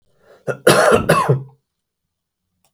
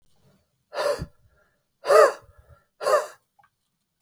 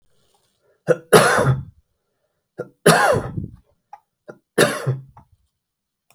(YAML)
cough_length: 2.7 s
cough_amplitude: 32768
cough_signal_mean_std_ratio: 0.42
exhalation_length: 4.0 s
exhalation_amplitude: 24408
exhalation_signal_mean_std_ratio: 0.31
three_cough_length: 6.1 s
three_cough_amplitude: 32768
three_cough_signal_mean_std_ratio: 0.36
survey_phase: beta (2021-08-13 to 2022-03-07)
age: 45-64
gender: Male
wearing_mask: 'No'
symptom_none: true
smoker_status: Never smoked
respiratory_condition_asthma: false
respiratory_condition_other: false
recruitment_source: REACT
submission_delay: 2 days
covid_test_result: Negative
covid_test_method: RT-qPCR
influenza_a_test_result: Negative
influenza_b_test_result: Negative